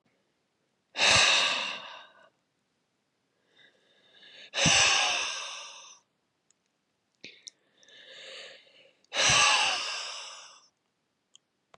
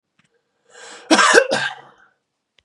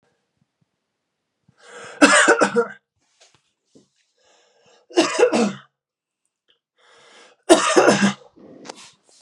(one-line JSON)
{"exhalation_length": "11.8 s", "exhalation_amplitude": 13323, "exhalation_signal_mean_std_ratio": 0.4, "cough_length": "2.6 s", "cough_amplitude": 32768, "cough_signal_mean_std_ratio": 0.36, "three_cough_length": "9.2 s", "three_cough_amplitude": 32767, "three_cough_signal_mean_std_ratio": 0.34, "survey_phase": "beta (2021-08-13 to 2022-03-07)", "age": "18-44", "gender": "Male", "wearing_mask": "No", "symptom_runny_or_blocked_nose": true, "smoker_status": "Never smoked", "respiratory_condition_asthma": true, "respiratory_condition_other": false, "recruitment_source": "Test and Trace", "submission_delay": "2 days", "covid_test_result": "Positive", "covid_test_method": "ePCR"}